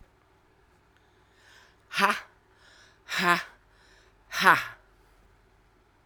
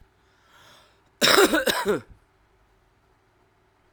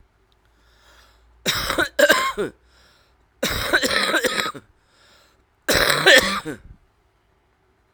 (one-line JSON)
{"exhalation_length": "6.1 s", "exhalation_amplitude": 22932, "exhalation_signal_mean_std_ratio": 0.27, "cough_length": "3.9 s", "cough_amplitude": 32767, "cough_signal_mean_std_ratio": 0.33, "three_cough_length": "7.9 s", "three_cough_amplitude": 32768, "three_cough_signal_mean_std_ratio": 0.43, "survey_phase": "beta (2021-08-13 to 2022-03-07)", "age": "45-64", "gender": "Female", "wearing_mask": "No", "symptom_cough_any": true, "symptom_new_continuous_cough": true, "symptom_sore_throat": true, "symptom_fatigue": true, "symptom_change_to_sense_of_smell_or_taste": true, "symptom_loss_of_taste": true, "symptom_other": true, "symptom_onset": "3 days", "smoker_status": "Never smoked", "respiratory_condition_asthma": false, "respiratory_condition_other": false, "recruitment_source": "Test and Trace", "submission_delay": "2 days", "covid_test_result": "Positive", "covid_test_method": "RT-qPCR", "covid_ct_value": 13.0, "covid_ct_gene": "ORF1ab gene", "covid_ct_mean": 13.5, "covid_viral_load": "36000000 copies/ml", "covid_viral_load_category": "High viral load (>1M copies/ml)"}